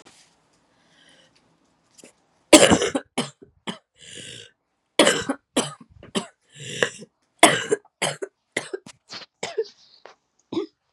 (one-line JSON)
{"three_cough_length": "10.9 s", "three_cough_amplitude": 32768, "three_cough_signal_mean_std_ratio": 0.28, "survey_phase": "beta (2021-08-13 to 2022-03-07)", "age": "18-44", "gender": "Female", "wearing_mask": "No", "symptom_cough_any": true, "symptom_abdominal_pain": true, "symptom_fatigue": true, "symptom_fever_high_temperature": true, "symptom_headache": true, "symptom_other": true, "smoker_status": "Never smoked", "respiratory_condition_asthma": false, "respiratory_condition_other": false, "recruitment_source": "Test and Trace", "submission_delay": "1 day", "covid_test_result": "Positive", "covid_test_method": "RT-qPCR"}